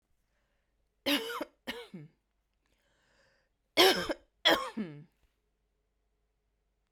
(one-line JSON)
{"cough_length": "6.9 s", "cough_amplitude": 10343, "cough_signal_mean_std_ratio": 0.28, "survey_phase": "beta (2021-08-13 to 2022-03-07)", "age": "18-44", "gender": "Female", "wearing_mask": "No", "symptom_cough_any": true, "symptom_new_continuous_cough": true, "symptom_sore_throat": true, "symptom_fatigue": true, "symptom_headache": true, "symptom_onset": "3 days", "smoker_status": "Never smoked", "respiratory_condition_asthma": false, "respiratory_condition_other": false, "recruitment_source": "Test and Trace", "submission_delay": "0 days", "covid_test_result": "Positive", "covid_test_method": "LAMP"}